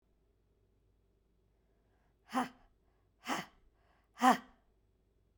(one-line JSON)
{"exhalation_length": "5.4 s", "exhalation_amplitude": 6668, "exhalation_signal_mean_std_ratio": 0.21, "survey_phase": "beta (2021-08-13 to 2022-03-07)", "age": "18-44", "gender": "Female", "wearing_mask": "No", "symptom_cough_any": true, "symptom_runny_or_blocked_nose": true, "symptom_sore_throat": true, "symptom_headache": true, "smoker_status": "Never smoked", "respiratory_condition_asthma": false, "respiratory_condition_other": false, "recruitment_source": "Test and Trace", "submission_delay": "2 days", "covid_test_result": "Positive", "covid_test_method": "RT-qPCR", "covid_ct_value": 35.7, "covid_ct_gene": "ORF1ab gene"}